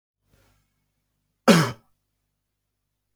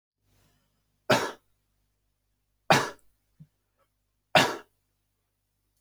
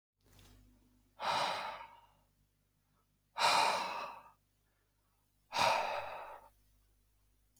{"cough_length": "3.2 s", "cough_amplitude": 26639, "cough_signal_mean_std_ratio": 0.2, "three_cough_length": "5.8 s", "three_cough_amplitude": 16542, "three_cough_signal_mean_std_ratio": 0.22, "exhalation_length": "7.6 s", "exhalation_amplitude": 4839, "exhalation_signal_mean_std_ratio": 0.41, "survey_phase": "beta (2021-08-13 to 2022-03-07)", "age": "18-44", "gender": "Male", "wearing_mask": "No", "symptom_diarrhoea": true, "symptom_change_to_sense_of_smell_or_taste": true, "symptom_onset": "4 days", "smoker_status": "Never smoked", "respiratory_condition_asthma": true, "respiratory_condition_other": false, "recruitment_source": "Test and Trace", "submission_delay": "1 day", "covid_test_result": "Positive", "covid_test_method": "RT-qPCR", "covid_ct_value": 38.9, "covid_ct_gene": "N gene"}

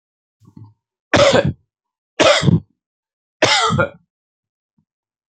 {"three_cough_length": "5.3 s", "three_cough_amplitude": 32768, "three_cough_signal_mean_std_ratio": 0.39, "survey_phase": "alpha (2021-03-01 to 2021-08-12)", "age": "65+", "gender": "Male", "wearing_mask": "No", "symptom_none": true, "smoker_status": "Never smoked", "respiratory_condition_asthma": false, "respiratory_condition_other": true, "recruitment_source": "REACT", "submission_delay": "2 days", "covid_test_result": "Negative", "covid_test_method": "RT-qPCR"}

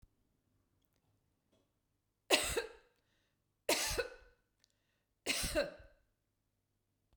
{"three_cough_length": "7.2 s", "three_cough_amplitude": 8528, "three_cough_signal_mean_std_ratio": 0.31, "survey_phase": "beta (2021-08-13 to 2022-03-07)", "age": "45-64", "gender": "Female", "wearing_mask": "No", "symptom_none": true, "smoker_status": "Never smoked", "respiratory_condition_asthma": false, "respiratory_condition_other": false, "recruitment_source": "REACT", "submission_delay": "3 days", "covid_test_result": "Negative", "covid_test_method": "RT-qPCR", "influenza_a_test_result": "Negative", "influenza_b_test_result": "Negative"}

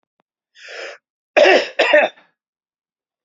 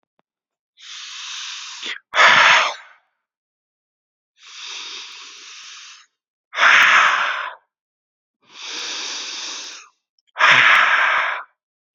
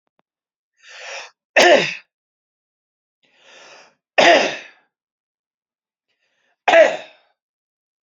{"cough_length": "3.2 s", "cough_amplitude": 29204, "cough_signal_mean_std_ratio": 0.36, "exhalation_length": "11.9 s", "exhalation_amplitude": 32768, "exhalation_signal_mean_std_ratio": 0.43, "three_cough_length": "8.0 s", "three_cough_amplitude": 32768, "three_cough_signal_mean_std_ratio": 0.29, "survey_phase": "beta (2021-08-13 to 2022-03-07)", "age": "18-44", "gender": "Male", "wearing_mask": "No", "symptom_none": true, "smoker_status": "Never smoked", "respiratory_condition_asthma": false, "respiratory_condition_other": false, "recruitment_source": "REACT", "submission_delay": "0 days", "covid_test_result": "Negative", "covid_test_method": "RT-qPCR"}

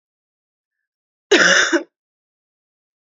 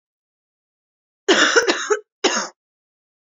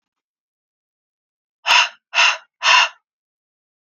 {"cough_length": "3.2 s", "cough_amplitude": 29079, "cough_signal_mean_std_ratio": 0.31, "three_cough_length": "3.2 s", "three_cough_amplitude": 28487, "three_cough_signal_mean_std_ratio": 0.38, "exhalation_length": "3.8 s", "exhalation_amplitude": 29809, "exhalation_signal_mean_std_ratio": 0.33, "survey_phase": "beta (2021-08-13 to 2022-03-07)", "age": "18-44", "gender": "Female", "wearing_mask": "No", "symptom_cough_any": true, "symptom_new_continuous_cough": true, "symptom_runny_or_blocked_nose": true, "symptom_sore_throat": true, "symptom_onset": "5 days", "smoker_status": "Never smoked", "respiratory_condition_asthma": false, "respiratory_condition_other": false, "recruitment_source": "Test and Trace", "submission_delay": "1 day", "covid_test_result": "Negative", "covid_test_method": "RT-qPCR"}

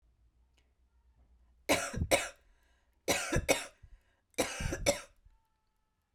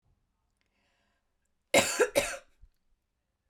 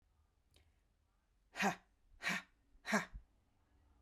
{"three_cough_length": "6.1 s", "three_cough_amplitude": 8268, "three_cough_signal_mean_std_ratio": 0.37, "cough_length": "3.5 s", "cough_amplitude": 13298, "cough_signal_mean_std_ratio": 0.27, "exhalation_length": "4.0 s", "exhalation_amplitude": 2498, "exhalation_signal_mean_std_ratio": 0.31, "survey_phase": "beta (2021-08-13 to 2022-03-07)", "age": "45-64", "gender": "Female", "wearing_mask": "No", "symptom_none": true, "smoker_status": "Ex-smoker", "respiratory_condition_asthma": false, "respiratory_condition_other": false, "recruitment_source": "REACT", "submission_delay": "1 day", "covid_test_result": "Negative", "covid_test_method": "RT-qPCR"}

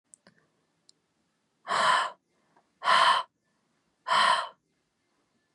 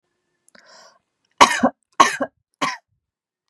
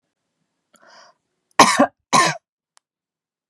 {"exhalation_length": "5.5 s", "exhalation_amplitude": 10572, "exhalation_signal_mean_std_ratio": 0.38, "three_cough_length": "3.5 s", "three_cough_amplitude": 32768, "three_cough_signal_mean_std_ratio": 0.26, "cough_length": "3.5 s", "cough_amplitude": 32768, "cough_signal_mean_std_ratio": 0.27, "survey_phase": "beta (2021-08-13 to 2022-03-07)", "age": "18-44", "gender": "Female", "wearing_mask": "No", "symptom_none": true, "smoker_status": "Never smoked", "respiratory_condition_asthma": false, "respiratory_condition_other": false, "recruitment_source": "REACT", "submission_delay": "1 day", "covid_test_result": "Negative", "covid_test_method": "RT-qPCR", "influenza_a_test_result": "Negative", "influenza_b_test_result": "Negative"}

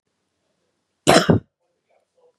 {"cough_length": "2.4 s", "cough_amplitude": 32402, "cough_signal_mean_std_ratio": 0.26, "survey_phase": "beta (2021-08-13 to 2022-03-07)", "age": "18-44", "gender": "Female", "wearing_mask": "No", "symptom_none": true, "smoker_status": "Never smoked", "respiratory_condition_asthma": false, "respiratory_condition_other": false, "recruitment_source": "REACT", "submission_delay": "2 days", "covid_test_result": "Negative", "covid_test_method": "RT-qPCR", "influenza_a_test_result": "Negative", "influenza_b_test_result": "Negative"}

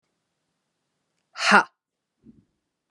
{"exhalation_length": "2.9 s", "exhalation_amplitude": 32385, "exhalation_signal_mean_std_ratio": 0.2, "survey_phase": "beta (2021-08-13 to 2022-03-07)", "age": "18-44", "gender": "Female", "wearing_mask": "No", "symptom_cough_any": true, "symptom_runny_or_blocked_nose": true, "symptom_fatigue": true, "symptom_headache": true, "symptom_change_to_sense_of_smell_or_taste": true, "symptom_loss_of_taste": true, "symptom_onset": "3 days", "smoker_status": "Never smoked", "respiratory_condition_asthma": false, "respiratory_condition_other": false, "recruitment_source": "Test and Trace", "submission_delay": "2 days", "covid_test_result": "Positive", "covid_test_method": "RT-qPCR", "covid_ct_value": 18.0, "covid_ct_gene": "N gene", "covid_ct_mean": 19.6, "covid_viral_load": "370000 copies/ml", "covid_viral_load_category": "Low viral load (10K-1M copies/ml)"}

